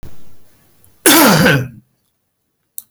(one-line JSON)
{"cough_length": "2.9 s", "cough_amplitude": 32768, "cough_signal_mean_std_ratio": 0.45, "survey_phase": "beta (2021-08-13 to 2022-03-07)", "age": "65+", "gender": "Male", "wearing_mask": "No", "symptom_none": true, "smoker_status": "Ex-smoker", "respiratory_condition_asthma": false, "respiratory_condition_other": false, "recruitment_source": "REACT", "submission_delay": "1 day", "covid_test_result": "Negative", "covid_test_method": "RT-qPCR"}